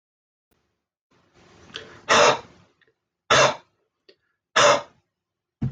{
  "exhalation_length": "5.7 s",
  "exhalation_amplitude": 21114,
  "exhalation_signal_mean_std_ratio": 0.31,
  "survey_phase": "alpha (2021-03-01 to 2021-08-12)",
  "age": "45-64",
  "gender": "Male",
  "wearing_mask": "No",
  "symptom_none": true,
  "smoker_status": "Never smoked",
  "respiratory_condition_asthma": false,
  "respiratory_condition_other": false,
  "recruitment_source": "REACT",
  "submission_delay": "1 day",
  "covid_test_result": "Negative",
  "covid_test_method": "RT-qPCR"
}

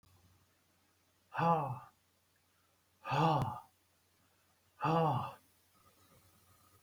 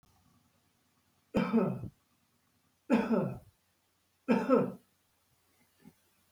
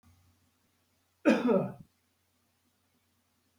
{
  "exhalation_length": "6.8 s",
  "exhalation_amplitude": 4718,
  "exhalation_signal_mean_std_ratio": 0.37,
  "three_cough_length": "6.3 s",
  "three_cough_amplitude": 6734,
  "three_cough_signal_mean_std_ratio": 0.36,
  "cough_length": "3.6 s",
  "cough_amplitude": 9079,
  "cough_signal_mean_std_ratio": 0.28,
  "survey_phase": "beta (2021-08-13 to 2022-03-07)",
  "age": "65+",
  "gender": "Male",
  "wearing_mask": "No",
  "symptom_none": true,
  "smoker_status": "Never smoked",
  "respiratory_condition_asthma": false,
  "respiratory_condition_other": false,
  "recruitment_source": "REACT",
  "submission_delay": "2 days",
  "covid_test_result": "Negative",
  "covid_test_method": "RT-qPCR",
  "influenza_a_test_result": "Negative",
  "influenza_b_test_result": "Negative"
}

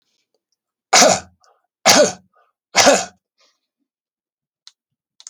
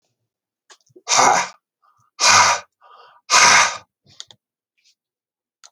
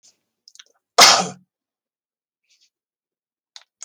{
  "three_cough_length": "5.3 s",
  "three_cough_amplitude": 32768,
  "three_cough_signal_mean_std_ratio": 0.31,
  "exhalation_length": "5.7 s",
  "exhalation_amplitude": 32768,
  "exhalation_signal_mean_std_ratio": 0.37,
  "cough_length": "3.8 s",
  "cough_amplitude": 32768,
  "cough_signal_mean_std_ratio": 0.2,
  "survey_phase": "beta (2021-08-13 to 2022-03-07)",
  "age": "65+",
  "gender": "Male",
  "wearing_mask": "No",
  "symptom_none": true,
  "symptom_onset": "5 days",
  "smoker_status": "Never smoked",
  "respiratory_condition_asthma": false,
  "respiratory_condition_other": false,
  "recruitment_source": "REACT",
  "submission_delay": "1 day",
  "covid_test_result": "Negative",
  "covid_test_method": "RT-qPCR"
}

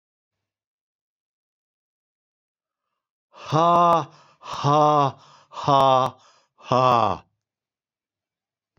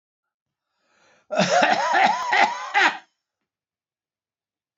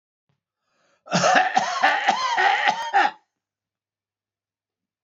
{
  "exhalation_length": "8.8 s",
  "exhalation_amplitude": 19579,
  "exhalation_signal_mean_std_ratio": 0.37,
  "three_cough_length": "4.8 s",
  "three_cough_amplitude": 21534,
  "three_cough_signal_mean_std_ratio": 0.46,
  "cough_length": "5.0 s",
  "cough_amplitude": 30606,
  "cough_signal_mean_std_ratio": 0.5,
  "survey_phase": "beta (2021-08-13 to 2022-03-07)",
  "age": "65+",
  "gender": "Male",
  "wearing_mask": "No",
  "symptom_none": true,
  "symptom_onset": "9 days",
  "smoker_status": "Ex-smoker",
  "respiratory_condition_asthma": false,
  "respiratory_condition_other": false,
  "recruitment_source": "REACT",
  "submission_delay": "3 days",
  "covid_test_result": "Negative",
  "covid_test_method": "RT-qPCR"
}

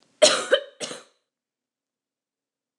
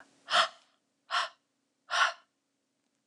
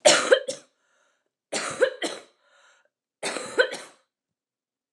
{
  "cough_length": "2.8 s",
  "cough_amplitude": 23568,
  "cough_signal_mean_std_ratio": 0.26,
  "exhalation_length": "3.1 s",
  "exhalation_amplitude": 7859,
  "exhalation_signal_mean_std_ratio": 0.33,
  "three_cough_length": "4.9 s",
  "three_cough_amplitude": 26602,
  "three_cough_signal_mean_std_ratio": 0.33,
  "survey_phase": "alpha (2021-03-01 to 2021-08-12)",
  "age": "18-44",
  "gender": "Female",
  "wearing_mask": "No",
  "symptom_cough_any": true,
  "symptom_fatigue": true,
  "symptom_headache": true,
  "symptom_onset": "12 days",
  "smoker_status": "Never smoked",
  "respiratory_condition_asthma": false,
  "respiratory_condition_other": false,
  "recruitment_source": "REACT",
  "submission_delay": "2 days",
  "covid_test_result": "Negative",
  "covid_test_method": "RT-qPCR"
}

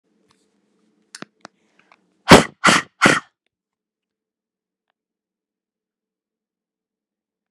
{
  "exhalation_length": "7.5 s",
  "exhalation_amplitude": 32768,
  "exhalation_signal_mean_std_ratio": 0.18,
  "survey_phase": "beta (2021-08-13 to 2022-03-07)",
  "age": "45-64",
  "gender": "Female",
  "wearing_mask": "No",
  "symptom_none": true,
  "symptom_onset": "12 days",
  "smoker_status": "Ex-smoker",
  "respiratory_condition_asthma": false,
  "respiratory_condition_other": false,
  "recruitment_source": "REACT",
  "submission_delay": "2 days",
  "covid_test_result": "Negative",
  "covid_test_method": "RT-qPCR"
}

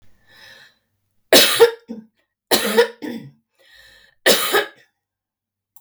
{
  "three_cough_length": "5.8 s",
  "three_cough_amplitude": 32768,
  "three_cough_signal_mean_std_ratio": 0.35,
  "survey_phase": "beta (2021-08-13 to 2022-03-07)",
  "age": "45-64",
  "gender": "Female",
  "wearing_mask": "No",
  "symptom_none": true,
  "smoker_status": "Ex-smoker",
  "respiratory_condition_asthma": false,
  "respiratory_condition_other": false,
  "recruitment_source": "REACT",
  "submission_delay": "2 days",
  "covid_test_result": "Negative",
  "covid_test_method": "RT-qPCR",
  "influenza_a_test_result": "Negative",
  "influenza_b_test_result": "Negative"
}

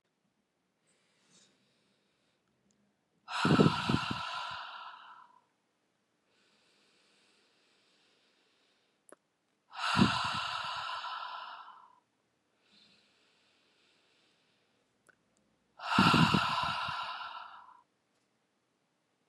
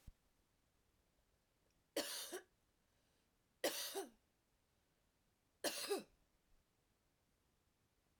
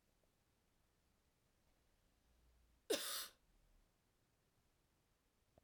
{
  "exhalation_length": "19.3 s",
  "exhalation_amplitude": 9829,
  "exhalation_signal_mean_std_ratio": 0.33,
  "three_cough_length": "8.2 s",
  "three_cough_amplitude": 1415,
  "three_cough_signal_mean_std_ratio": 0.31,
  "cough_length": "5.6 s",
  "cough_amplitude": 1476,
  "cough_signal_mean_std_ratio": 0.23,
  "survey_phase": "beta (2021-08-13 to 2022-03-07)",
  "age": "18-44",
  "gender": "Female",
  "wearing_mask": "No",
  "symptom_runny_or_blocked_nose": true,
  "symptom_fatigue": true,
  "symptom_headache": true,
  "symptom_onset": "4 days",
  "smoker_status": "Never smoked",
  "respiratory_condition_asthma": false,
  "respiratory_condition_other": false,
  "recruitment_source": "REACT",
  "submission_delay": "2 days",
  "covid_test_result": "Positive",
  "covid_test_method": "RT-qPCR",
  "covid_ct_value": 22.0,
  "covid_ct_gene": "E gene",
  "influenza_a_test_result": "Negative",
  "influenza_b_test_result": "Negative"
}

